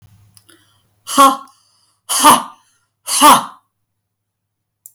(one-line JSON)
{"exhalation_length": "4.9 s", "exhalation_amplitude": 32768, "exhalation_signal_mean_std_ratio": 0.34, "survey_phase": "alpha (2021-03-01 to 2021-08-12)", "age": "65+", "gender": "Female", "wearing_mask": "No", "symptom_none": true, "smoker_status": "Ex-smoker", "respiratory_condition_asthma": false, "respiratory_condition_other": false, "recruitment_source": "REACT", "submission_delay": "1 day", "covid_test_result": "Negative", "covid_test_method": "RT-qPCR"}